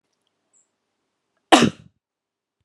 {"cough_length": "2.6 s", "cough_amplitude": 32767, "cough_signal_mean_std_ratio": 0.19, "survey_phase": "beta (2021-08-13 to 2022-03-07)", "age": "45-64", "gender": "Female", "wearing_mask": "No", "symptom_none": true, "smoker_status": "Ex-smoker", "respiratory_condition_asthma": false, "respiratory_condition_other": false, "recruitment_source": "REACT", "submission_delay": "2 days", "covid_test_result": "Negative", "covid_test_method": "RT-qPCR"}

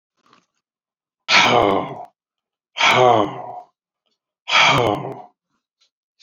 {"exhalation_length": "6.2 s", "exhalation_amplitude": 29337, "exhalation_signal_mean_std_ratio": 0.43, "survey_phase": "beta (2021-08-13 to 2022-03-07)", "age": "65+", "gender": "Male", "wearing_mask": "No", "symptom_none": true, "smoker_status": "Never smoked", "respiratory_condition_asthma": false, "respiratory_condition_other": false, "recruitment_source": "REACT", "submission_delay": "3 days", "covid_test_result": "Negative", "covid_test_method": "RT-qPCR"}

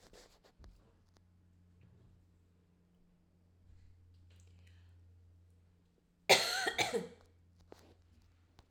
{"cough_length": "8.7 s", "cough_amplitude": 8626, "cough_signal_mean_std_ratio": 0.24, "survey_phase": "alpha (2021-03-01 to 2021-08-12)", "age": "18-44", "gender": "Female", "wearing_mask": "No", "symptom_none": true, "smoker_status": "Ex-smoker", "respiratory_condition_asthma": false, "respiratory_condition_other": false, "recruitment_source": "REACT", "submission_delay": "1 day", "covid_test_result": "Negative", "covid_test_method": "RT-qPCR"}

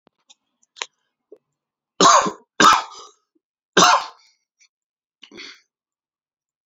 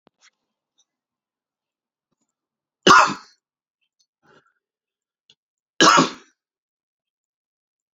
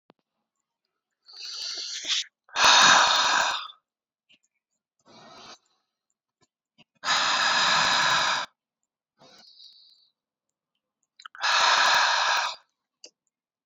{"three_cough_length": "6.7 s", "three_cough_amplitude": 31193, "three_cough_signal_mean_std_ratio": 0.28, "cough_length": "7.9 s", "cough_amplitude": 29132, "cough_signal_mean_std_ratio": 0.2, "exhalation_length": "13.7 s", "exhalation_amplitude": 18666, "exhalation_signal_mean_std_ratio": 0.45, "survey_phase": "alpha (2021-03-01 to 2021-08-12)", "age": "18-44", "gender": "Male", "wearing_mask": "Yes", "symptom_shortness_of_breath": true, "symptom_fatigue": true, "symptom_headache": true, "symptom_change_to_sense_of_smell_or_taste": true, "symptom_loss_of_taste": true, "symptom_onset": "5 days", "smoker_status": "Ex-smoker", "respiratory_condition_asthma": false, "respiratory_condition_other": false, "recruitment_source": "Test and Trace", "submission_delay": "2 days", "covid_test_result": "Positive", "covid_test_method": "RT-qPCR", "covid_ct_value": 31.8, "covid_ct_gene": "N gene"}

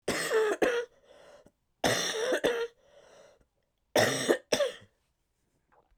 {"three_cough_length": "6.0 s", "three_cough_amplitude": 11905, "three_cough_signal_mean_std_ratio": 0.5, "survey_phase": "beta (2021-08-13 to 2022-03-07)", "age": "45-64", "gender": "Female", "wearing_mask": "No", "symptom_cough_any": true, "symptom_new_continuous_cough": true, "symptom_shortness_of_breath": true, "symptom_change_to_sense_of_smell_or_taste": true, "smoker_status": "Never smoked", "respiratory_condition_asthma": true, "respiratory_condition_other": false, "recruitment_source": "Test and Trace", "submission_delay": "2 days", "covid_test_result": "Positive", "covid_test_method": "LFT"}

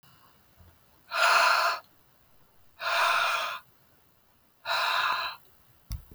{"exhalation_length": "6.1 s", "exhalation_amplitude": 10342, "exhalation_signal_mean_std_ratio": 0.51, "survey_phase": "beta (2021-08-13 to 2022-03-07)", "age": "18-44", "gender": "Female", "wearing_mask": "No", "symptom_none": true, "smoker_status": "Ex-smoker", "respiratory_condition_asthma": false, "respiratory_condition_other": false, "recruitment_source": "REACT", "submission_delay": "1 day", "covid_test_result": "Negative", "covid_test_method": "RT-qPCR"}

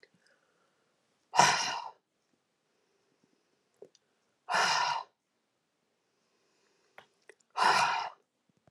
{"exhalation_length": "8.7 s", "exhalation_amplitude": 13000, "exhalation_signal_mean_std_ratio": 0.32, "survey_phase": "alpha (2021-03-01 to 2021-08-12)", "age": "45-64", "gender": "Female", "wearing_mask": "No", "symptom_none": true, "smoker_status": "Never smoked", "respiratory_condition_asthma": false, "respiratory_condition_other": false, "recruitment_source": "Test and Trace", "submission_delay": "2 days", "covid_test_result": "Positive", "covid_test_method": "RT-qPCR", "covid_ct_value": 22.8, "covid_ct_gene": "ORF1ab gene"}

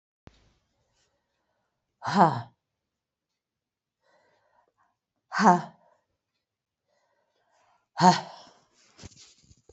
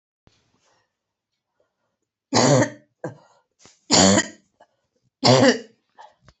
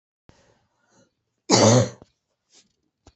{"exhalation_length": "9.7 s", "exhalation_amplitude": 22564, "exhalation_signal_mean_std_ratio": 0.21, "three_cough_length": "6.4 s", "three_cough_amplitude": 28242, "three_cough_signal_mean_std_ratio": 0.33, "cough_length": "3.2 s", "cough_amplitude": 27841, "cough_signal_mean_std_ratio": 0.28, "survey_phase": "beta (2021-08-13 to 2022-03-07)", "age": "65+", "gender": "Female", "wearing_mask": "No", "symptom_cough_any": true, "symptom_runny_or_blocked_nose": true, "symptom_sore_throat": true, "symptom_diarrhoea": true, "symptom_fatigue": true, "symptom_change_to_sense_of_smell_or_taste": true, "symptom_other": true, "symptom_onset": "3 days", "smoker_status": "Ex-smoker", "respiratory_condition_asthma": false, "respiratory_condition_other": false, "recruitment_source": "Test and Trace", "submission_delay": "1 day", "covid_test_result": "Positive", "covid_test_method": "RT-qPCR", "covid_ct_value": 20.9, "covid_ct_gene": "ORF1ab gene", "covid_ct_mean": 21.6, "covid_viral_load": "82000 copies/ml", "covid_viral_load_category": "Low viral load (10K-1M copies/ml)"}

